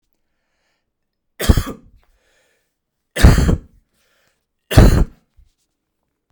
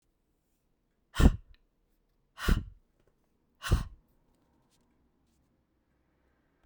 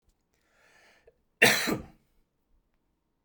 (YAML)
three_cough_length: 6.3 s
three_cough_amplitude: 32768
three_cough_signal_mean_std_ratio: 0.29
exhalation_length: 6.7 s
exhalation_amplitude: 14109
exhalation_signal_mean_std_ratio: 0.2
cough_length: 3.2 s
cough_amplitude: 20011
cough_signal_mean_std_ratio: 0.24
survey_phase: beta (2021-08-13 to 2022-03-07)
age: 18-44
gender: Male
wearing_mask: 'No'
symptom_none: true
smoker_status: Never smoked
respiratory_condition_asthma: false
respiratory_condition_other: false
recruitment_source: REACT
submission_delay: 4 days
covid_test_result: Negative
covid_test_method: RT-qPCR